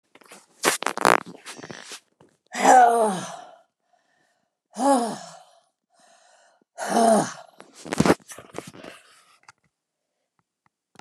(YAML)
exhalation_length: 11.0 s
exhalation_amplitude: 29204
exhalation_signal_mean_std_ratio: 0.33
survey_phase: beta (2021-08-13 to 2022-03-07)
age: 65+
gender: Female
wearing_mask: 'No'
symptom_cough_any: true
symptom_runny_or_blocked_nose: true
smoker_status: Never smoked
respiratory_condition_asthma: false
respiratory_condition_other: false
recruitment_source: Test and Trace
submission_delay: 2 days
covid_test_result: Positive
covid_test_method: RT-qPCR
covid_ct_value: 20.5
covid_ct_gene: ORF1ab gene
covid_ct_mean: 21.1
covid_viral_load: 120000 copies/ml
covid_viral_load_category: Low viral load (10K-1M copies/ml)